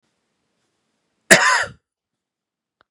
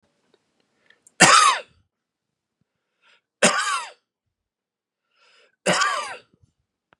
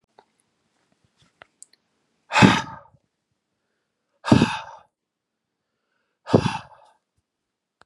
{
  "cough_length": "2.9 s",
  "cough_amplitude": 32768,
  "cough_signal_mean_std_ratio": 0.25,
  "three_cough_length": "7.0 s",
  "three_cough_amplitude": 32767,
  "three_cough_signal_mean_std_ratio": 0.3,
  "exhalation_length": "7.9 s",
  "exhalation_amplitude": 31975,
  "exhalation_signal_mean_std_ratio": 0.22,
  "survey_phase": "beta (2021-08-13 to 2022-03-07)",
  "age": "45-64",
  "gender": "Male",
  "wearing_mask": "No",
  "symptom_none": true,
  "smoker_status": "Never smoked",
  "respiratory_condition_asthma": false,
  "respiratory_condition_other": false,
  "recruitment_source": "REACT",
  "submission_delay": "2 days",
  "covid_test_result": "Negative",
  "covid_test_method": "RT-qPCR",
  "influenza_a_test_result": "Negative",
  "influenza_b_test_result": "Negative"
}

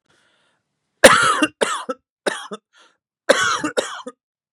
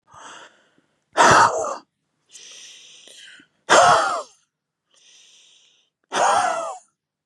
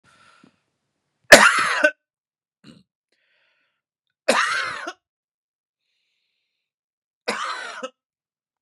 {
  "cough_length": "4.5 s",
  "cough_amplitude": 32768,
  "cough_signal_mean_std_ratio": 0.36,
  "exhalation_length": "7.3 s",
  "exhalation_amplitude": 31068,
  "exhalation_signal_mean_std_ratio": 0.38,
  "three_cough_length": "8.6 s",
  "three_cough_amplitude": 32768,
  "three_cough_signal_mean_std_ratio": 0.24,
  "survey_phase": "beta (2021-08-13 to 2022-03-07)",
  "age": "45-64",
  "gender": "Male",
  "wearing_mask": "No",
  "symptom_none": true,
  "smoker_status": "Ex-smoker",
  "respiratory_condition_asthma": false,
  "respiratory_condition_other": false,
  "recruitment_source": "REACT",
  "submission_delay": "1 day",
  "covid_test_result": "Negative",
  "covid_test_method": "RT-qPCR",
  "influenza_a_test_result": "Negative",
  "influenza_b_test_result": "Negative"
}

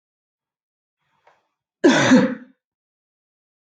{
  "cough_length": "3.7 s",
  "cough_amplitude": 24236,
  "cough_signal_mean_std_ratio": 0.29,
  "survey_phase": "beta (2021-08-13 to 2022-03-07)",
  "age": "18-44",
  "gender": "Female",
  "wearing_mask": "No",
  "symptom_cough_any": true,
  "symptom_runny_or_blocked_nose": true,
  "symptom_onset": "12 days",
  "smoker_status": "Never smoked",
  "respiratory_condition_asthma": false,
  "respiratory_condition_other": false,
  "recruitment_source": "REACT",
  "submission_delay": "1 day",
  "covid_test_result": "Negative",
  "covid_test_method": "RT-qPCR",
  "influenza_a_test_result": "Negative",
  "influenza_b_test_result": "Negative"
}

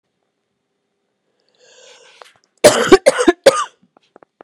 {
  "cough_length": "4.4 s",
  "cough_amplitude": 32768,
  "cough_signal_mean_std_ratio": 0.28,
  "survey_phase": "beta (2021-08-13 to 2022-03-07)",
  "age": "18-44",
  "gender": "Female",
  "wearing_mask": "No",
  "symptom_cough_any": true,
  "symptom_runny_or_blocked_nose": true,
  "symptom_shortness_of_breath": true,
  "symptom_sore_throat": true,
  "smoker_status": "Prefer not to say",
  "respiratory_condition_asthma": false,
  "respiratory_condition_other": false,
  "recruitment_source": "Test and Trace",
  "submission_delay": "2 days",
  "covid_test_result": "Positive",
  "covid_test_method": "RT-qPCR",
  "covid_ct_value": 25.8,
  "covid_ct_gene": "ORF1ab gene"
}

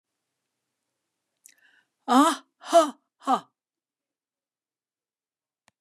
{
  "exhalation_length": "5.8 s",
  "exhalation_amplitude": 16442,
  "exhalation_signal_mean_std_ratio": 0.24,
  "survey_phase": "beta (2021-08-13 to 2022-03-07)",
  "age": "45-64",
  "gender": "Female",
  "wearing_mask": "No",
  "symptom_none": true,
  "smoker_status": "Never smoked",
  "respiratory_condition_asthma": false,
  "respiratory_condition_other": false,
  "recruitment_source": "REACT",
  "submission_delay": "6 days",
  "covid_test_result": "Negative",
  "covid_test_method": "RT-qPCR",
  "influenza_a_test_result": "Negative",
  "influenza_b_test_result": "Negative"
}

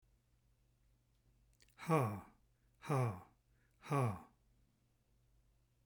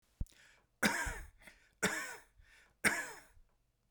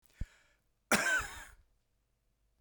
{
  "exhalation_length": "5.9 s",
  "exhalation_amplitude": 2681,
  "exhalation_signal_mean_std_ratio": 0.34,
  "three_cough_length": "3.9 s",
  "three_cough_amplitude": 7310,
  "three_cough_signal_mean_std_ratio": 0.38,
  "cough_length": "2.6 s",
  "cough_amplitude": 7217,
  "cough_signal_mean_std_ratio": 0.33,
  "survey_phase": "beta (2021-08-13 to 2022-03-07)",
  "age": "65+",
  "gender": "Male",
  "wearing_mask": "No",
  "symptom_abdominal_pain": true,
  "symptom_onset": "8 days",
  "smoker_status": "Never smoked",
  "respiratory_condition_asthma": false,
  "respiratory_condition_other": false,
  "recruitment_source": "REACT",
  "submission_delay": "1 day",
  "covid_test_result": "Negative",
  "covid_test_method": "RT-qPCR"
}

